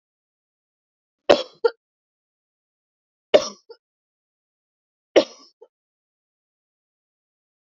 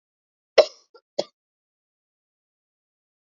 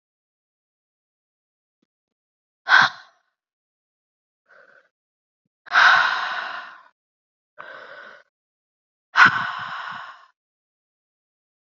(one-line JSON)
{"three_cough_length": "7.8 s", "three_cough_amplitude": 32763, "three_cough_signal_mean_std_ratio": 0.14, "cough_length": "3.2 s", "cough_amplitude": 27535, "cough_signal_mean_std_ratio": 0.12, "exhalation_length": "11.8 s", "exhalation_amplitude": 30793, "exhalation_signal_mean_std_ratio": 0.26, "survey_phase": "beta (2021-08-13 to 2022-03-07)", "age": "18-44", "gender": "Female", "wearing_mask": "No", "symptom_cough_any": true, "symptom_runny_or_blocked_nose": true, "symptom_shortness_of_breath": true, "symptom_sore_throat": true, "symptom_fatigue": true, "symptom_change_to_sense_of_smell_or_taste": true, "symptom_loss_of_taste": true, "symptom_onset": "2 days", "smoker_status": "Never smoked", "respiratory_condition_asthma": false, "respiratory_condition_other": false, "recruitment_source": "Test and Trace", "submission_delay": "1 day", "covid_test_result": "Positive", "covid_test_method": "RT-qPCR", "covid_ct_value": 17.1, "covid_ct_gene": "ORF1ab gene", "covid_ct_mean": 17.4, "covid_viral_load": "2000000 copies/ml", "covid_viral_load_category": "High viral load (>1M copies/ml)"}